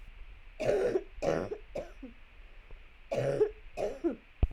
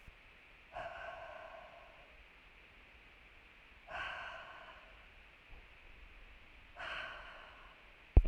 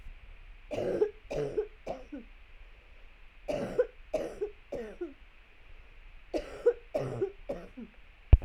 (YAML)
cough_length: 4.5 s
cough_amplitude: 6371
cough_signal_mean_std_ratio: 0.58
exhalation_length: 8.3 s
exhalation_amplitude: 8143
exhalation_signal_mean_std_ratio: 0.27
three_cough_length: 8.4 s
three_cough_amplitude: 16911
three_cough_signal_mean_std_ratio: 0.39
survey_phase: beta (2021-08-13 to 2022-03-07)
age: 18-44
gender: Female
wearing_mask: 'No'
symptom_cough_any: true
symptom_new_continuous_cough: true
symptom_runny_or_blocked_nose: true
symptom_shortness_of_breath: true
symptom_sore_throat: true
symptom_fatigue: true
symptom_headache: true
symptom_onset: 2 days
smoker_status: Current smoker (e-cigarettes or vapes only)
respiratory_condition_asthma: false
respiratory_condition_other: false
recruitment_source: Test and Trace
submission_delay: 1 day
covid_test_result: Positive
covid_test_method: ePCR